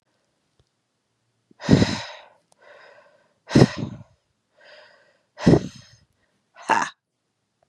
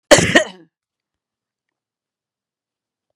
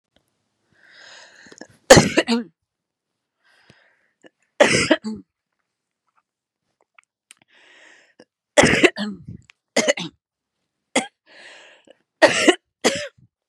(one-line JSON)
{"exhalation_length": "7.7 s", "exhalation_amplitude": 32174, "exhalation_signal_mean_std_ratio": 0.25, "cough_length": "3.2 s", "cough_amplitude": 32768, "cough_signal_mean_std_ratio": 0.22, "three_cough_length": "13.5 s", "three_cough_amplitude": 32768, "three_cough_signal_mean_std_ratio": 0.27, "survey_phase": "beta (2021-08-13 to 2022-03-07)", "age": "45-64", "gender": "Female", "wearing_mask": "No", "symptom_cough_any": true, "symptom_runny_or_blocked_nose": true, "symptom_shortness_of_breath": true, "symptom_sore_throat": true, "symptom_diarrhoea": true, "symptom_fatigue": true, "symptom_headache": true, "symptom_change_to_sense_of_smell_or_taste": true, "smoker_status": "Ex-smoker", "respiratory_condition_asthma": true, "respiratory_condition_other": false, "recruitment_source": "Test and Trace", "submission_delay": "1 day", "covid_test_result": "Positive", "covid_test_method": "LFT"}